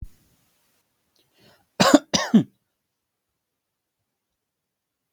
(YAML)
cough_length: 5.1 s
cough_amplitude: 32766
cough_signal_mean_std_ratio: 0.2
survey_phase: beta (2021-08-13 to 2022-03-07)
age: 18-44
gender: Male
wearing_mask: 'No'
symptom_none: true
smoker_status: Never smoked
respiratory_condition_asthma: false
respiratory_condition_other: false
recruitment_source: REACT
submission_delay: 2 days
covid_test_result: Negative
covid_test_method: RT-qPCR